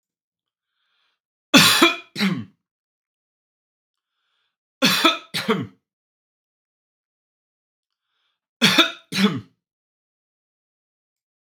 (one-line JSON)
{"three_cough_length": "11.5 s", "three_cough_amplitude": 32768, "three_cough_signal_mean_std_ratio": 0.28, "survey_phase": "beta (2021-08-13 to 2022-03-07)", "age": "45-64", "gender": "Male", "wearing_mask": "No", "symptom_none": true, "smoker_status": "Never smoked", "respiratory_condition_asthma": false, "respiratory_condition_other": false, "recruitment_source": "REACT", "submission_delay": "2 days", "covid_test_result": "Negative", "covid_test_method": "RT-qPCR", "influenza_a_test_result": "Negative", "influenza_b_test_result": "Negative"}